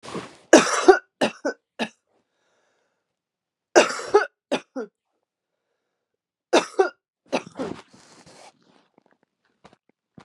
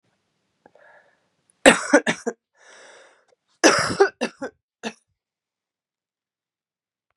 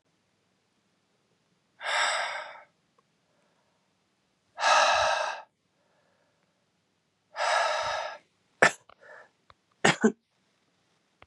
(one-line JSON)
{"three_cough_length": "10.2 s", "three_cough_amplitude": 32560, "three_cough_signal_mean_std_ratio": 0.26, "cough_length": "7.2 s", "cough_amplitude": 32768, "cough_signal_mean_std_ratio": 0.24, "exhalation_length": "11.3 s", "exhalation_amplitude": 27725, "exhalation_signal_mean_std_ratio": 0.35, "survey_phase": "beta (2021-08-13 to 2022-03-07)", "age": "45-64", "gender": "Female", "wearing_mask": "No", "symptom_cough_any": true, "symptom_runny_or_blocked_nose": true, "symptom_shortness_of_breath": true, "symptom_abdominal_pain": true, "symptom_fatigue": true, "symptom_onset": "9 days", "smoker_status": "Never smoked", "respiratory_condition_asthma": false, "respiratory_condition_other": false, "recruitment_source": "Test and Trace", "submission_delay": "1 day", "covid_test_result": "Positive", "covid_test_method": "RT-qPCR"}